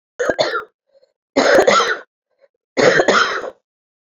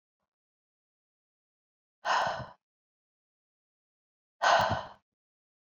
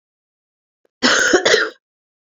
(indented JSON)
{
  "three_cough_length": "4.1 s",
  "three_cough_amplitude": 28771,
  "three_cough_signal_mean_std_ratio": 0.51,
  "exhalation_length": "5.6 s",
  "exhalation_amplitude": 8692,
  "exhalation_signal_mean_std_ratio": 0.28,
  "cough_length": "2.2 s",
  "cough_amplitude": 31071,
  "cough_signal_mean_std_ratio": 0.44,
  "survey_phase": "beta (2021-08-13 to 2022-03-07)",
  "age": "18-44",
  "gender": "Male",
  "wearing_mask": "No",
  "symptom_cough_any": true,
  "symptom_runny_or_blocked_nose": true,
  "symptom_shortness_of_breath": true,
  "symptom_fatigue": true,
  "symptom_headache": true,
  "smoker_status": "Ex-smoker",
  "respiratory_condition_asthma": false,
  "respiratory_condition_other": false,
  "recruitment_source": "Test and Trace",
  "submission_delay": "1 day",
  "covid_test_result": "Negative",
  "covid_test_method": "ePCR"
}